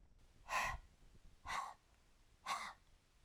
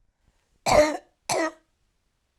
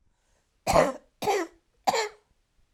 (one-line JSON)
{"exhalation_length": "3.2 s", "exhalation_amplitude": 1413, "exhalation_signal_mean_std_ratio": 0.48, "cough_length": "2.4 s", "cough_amplitude": 16181, "cough_signal_mean_std_ratio": 0.35, "three_cough_length": "2.7 s", "three_cough_amplitude": 15775, "three_cough_signal_mean_std_ratio": 0.39, "survey_phase": "alpha (2021-03-01 to 2021-08-12)", "age": "45-64", "gender": "Female", "wearing_mask": "No", "symptom_fatigue": true, "symptom_headache": true, "symptom_onset": "2 days", "smoker_status": "Never smoked", "respiratory_condition_asthma": false, "respiratory_condition_other": false, "recruitment_source": "Test and Trace", "submission_delay": "2 days", "covid_test_result": "Positive", "covid_test_method": "RT-qPCR", "covid_ct_value": 22.1, "covid_ct_gene": "N gene", "covid_ct_mean": 22.1, "covid_viral_load": "55000 copies/ml", "covid_viral_load_category": "Low viral load (10K-1M copies/ml)"}